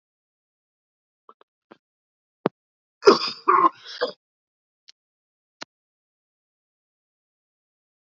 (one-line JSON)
{"cough_length": "8.1 s", "cough_amplitude": 29276, "cough_signal_mean_std_ratio": 0.18, "survey_phase": "beta (2021-08-13 to 2022-03-07)", "age": "45-64", "gender": "Male", "wearing_mask": "No", "symptom_cough_any": true, "symptom_new_continuous_cough": true, "symptom_headache": true, "symptom_loss_of_taste": true, "smoker_status": "Never smoked", "respiratory_condition_asthma": false, "respiratory_condition_other": false, "recruitment_source": "Test and Trace", "submission_delay": "2 days", "covid_test_result": "Positive", "covid_test_method": "RT-qPCR", "covid_ct_value": 32.4, "covid_ct_gene": "ORF1ab gene", "covid_ct_mean": 33.6, "covid_viral_load": "9.7 copies/ml", "covid_viral_load_category": "Minimal viral load (< 10K copies/ml)"}